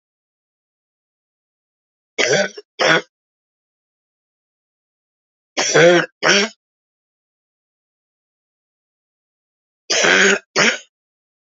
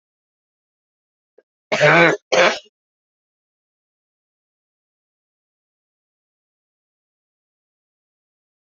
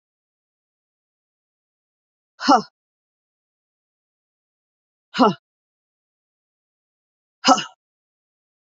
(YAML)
three_cough_length: 11.5 s
three_cough_amplitude: 32768
three_cough_signal_mean_std_ratio: 0.32
cough_length: 8.7 s
cough_amplitude: 28920
cough_signal_mean_std_ratio: 0.21
exhalation_length: 8.8 s
exhalation_amplitude: 28551
exhalation_signal_mean_std_ratio: 0.17
survey_phase: beta (2021-08-13 to 2022-03-07)
age: 45-64
gender: Female
wearing_mask: 'No'
symptom_cough_any: true
symptom_runny_or_blocked_nose: true
symptom_shortness_of_breath: true
symptom_abdominal_pain: true
symptom_fatigue: true
symptom_change_to_sense_of_smell_or_taste: true
symptom_loss_of_taste: true
symptom_onset: 3 days
smoker_status: Never smoked
respiratory_condition_asthma: false
respiratory_condition_other: false
recruitment_source: Test and Trace
submission_delay: 2 days
covid_test_result: Positive
covid_test_method: RT-qPCR
covid_ct_value: 17.1
covid_ct_gene: ORF1ab gene
covid_ct_mean: 18.5
covid_viral_load: 890000 copies/ml
covid_viral_load_category: Low viral load (10K-1M copies/ml)